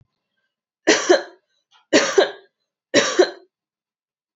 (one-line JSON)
{"three_cough_length": "4.4 s", "three_cough_amplitude": 28152, "three_cough_signal_mean_std_ratio": 0.35, "survey_phase": "beta (2021-08-13 to 2022-03-07)", "age": "18-44", "gender": "Female", "wearing_mask": "No", "symptom_none": true, "smoker_status": "Never smoked", "respiratory_condition_asthma": false, "respiratory_condition_other": false, "recruitment_source": "REACT", "submission_delay": "1 day", "covid_test_result": "Negative", "covid_test_method": "RT-qPCR", "influenza_a_test_result": "Negative", "influenza_b_test_result": "Negative"}